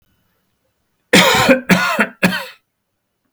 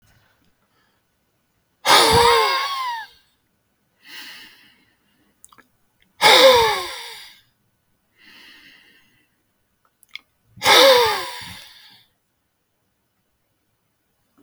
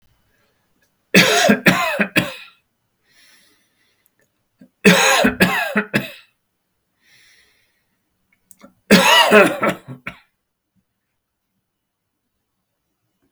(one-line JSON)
{"cough_length": "3.3 s", "cough_amplitude": 32768, "cough_signal_mean_std_ratio": 0.44, "exhalation_length": "14.4 s", "exhalation_amplitude": 32768, "exhalation_signal_mean_std_ratio": 0.32, "three_cough_length": "13.3 s", "three_cough_amplitude": 32768, "three_cough_signal_mean_std_ratio": 0.35, "survey_phase": "beta (2021-08-13 to 2022-03-07)", "age": "65+", "gender": "Male", "wearing_mask": "No", "symptom_none": true, "smoker_status": "Never smoked", "respiratory_condition_asthma": false, "respiratory_condition_other": false, "recruitment_source": "REACT", "submission_delay": "4 days", "covid_test_result": "Negative", "covid_test_method": "RT-qPCR", "influenza_a_test_result": "Negative", "influenza_b_test_result": "Negative"}